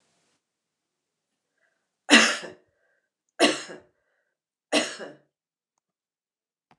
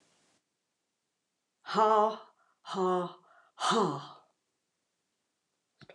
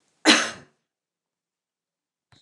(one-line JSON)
{"three_cough_length": "6.8 s", "three_cough_amplitude": 28918, "three_cough_signal_mean_std_ratio": 0.22, "exhalation_length": "5.9 s", "exhalation_amplitude": 7480, "exhalation_signal_mean_std_ratio": 0.36, "cough_length": "2.4 s", "cough_amplitude": 26679, "cough_signal_mean_std_ratio": 0.23, "survey_phase": "beta (2021-08-13 to 2022-03-07)", "age": "65+", "gender": "Female", "wearing_mask": "No", "symptom_none": true, "smoker_status": "Never smoked", "respiratory_condition_asthma": false, "respiratory_condition_other": false, "recruitment_source": "REACT", "submission_delay": "3 days", "covid_test_result": "Negative", "covid_test_method": "RT-qPCR", "influenza_a_test_result": "Negative", "influenza_b_test_result": "Negative"}